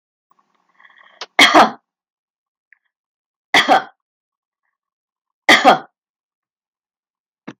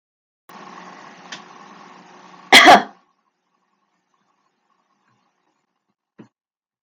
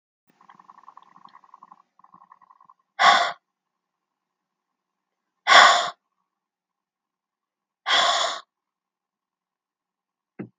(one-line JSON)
{"three_cough_length": "7.6 s", "three_cough_amplitude": 32768, "three_cough_signal_mean_std_ratio": 0.26, "cough_length": "6.8 s", "cough_amplitude": 32768, "cough_signal_mean_std_ratio": 0.19, "exhalation_length": "10.6 s", "exhalation_amplitude": 32766, "exhalation_signal_mean_std_ratio": 0.25, "survey_phase": "beta (2021-08-13 to 2022-03-07)", "age": "45-64", "gender": "Female", "wearing_mask": "No", "symptom_fatigue": true, "smoker_status": "Never smoked", "respiratory_condition_asthma": false, "respiratory_condition_other": false, "recruitment_source": "REACT", "submission_delay": "1 day", "covid_test_result": "Negative", "covid_test_method": "RT-qPCR", "influenza_a_test_result": "Negative", "influenza_b_test_result": "Negative"}